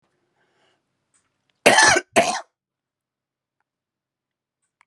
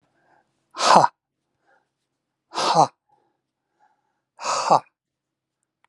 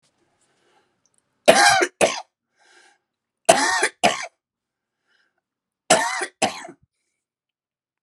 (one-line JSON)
{"cough_length": "4.9 s", "cough_amplitude": 32767, "cough_signal_mean_std_ratio": 0.25, "exhalation_length": "5.9 s", "exhalation_amplitude": 32768, "exhalation_signal_mean_std_ratio": 0.28, "three_cough_length": "8.0 s", "three_cough_amplitude": 32768, "three_cough_signal_mean_std_ratio": 0.32, "survey_phase": "alpha (2021-03-01 to 2021-08-12)", "age": "45-64", "gender": "Male", "wearing_mask": "No", "symptom_cough_any": true, "symptom_onset": "12 days", "smoker_status": "Ex-smoker", "respiratory_condition_asthma": true, "respiratory_condition_other": false, "recruitment_source": "REACT", "submission_delay": "2 days", "covid_test_result": "Negative", "covid_test_method": "RT-qPCR"}